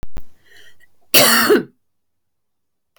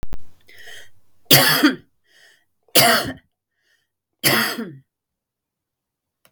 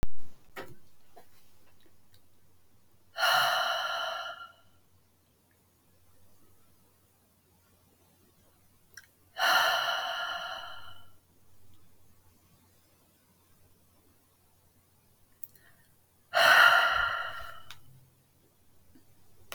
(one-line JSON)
{"cough_length": "3.0 s", "cough_amplitude": 32768, "cough_signal_mean_std_ratio": 0.43, "three_cough_length": "6.3 s", "three_cough_amplitude": 32768, "three_cough_signal_mean_std_ratio": 0.39, "exhalation_length": "19.5 s", "exhalation_amplitude": 13327, "exhalation_signal_mean_std_ratio": 0.36, "survey_phase": "beta (2021-08-13 to 2022-03-07)", "age": "18-44", "gender": "Female", "wearing_mask": "No", "symptom_fatigue": true, "smoker_status": "Never smoked", "respiratory_condition_asthma": false, "respiratory_condition_other": false, "recruitment_source": "REACT", "submission_delay": "1 day", "covid_test_result": "Negative", "covid_test_method": "RT-qPCR", "influenza_a_test_result": "Negative", "influenza_b_test_result": "Negative"}